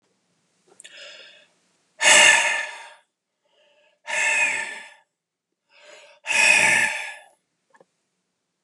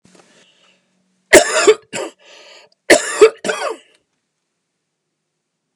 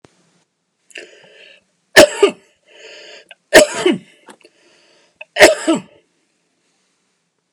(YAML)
exhalation_length: 8.6 s
exhalation_amplitude: 30358
exhalation_signal_mean_std_ratio: 0.38
cough_length: 5.8 s
cough_amplitude: 32768
cough_signal_mean_std_ratio: 0.29
three_cough_length: 7.5 s
three_cough_amplitude: 32768
three_cough_signal_mean_std_ratio: 0.27
survey_phase: alpha (2021-03-01 to 2021-08-12)
age: 45-64
gender: Male
wearing_mask: 'No'
symptom_none: true
smoker_status: Ex-smoker
respiratory_condition_asthma: false
respiratory_condition_other: false
recruitment_source: REACT
submission_delay: 1 day
covid_test_result: Negative
covid_test_method: RT-qPCR